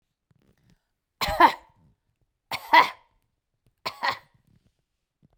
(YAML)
cough_length: 5.4 s
cough_amplitude: 27504
cough_signal_mean_std_ratio: 0.24
survey_phase: beta (2021-08-13 to 2022-03-07)
age: 45-64
gender: Female
wearing_mask: 'No'
symptom_none: true
smoker_status: Never smoked
respiratory_condition_asthma: false
respiratory_condition_other: false
recruitment_source: REACT
submission_delay: 2 days
covid_test_result: Negative
covid_test_method: RT-qPCR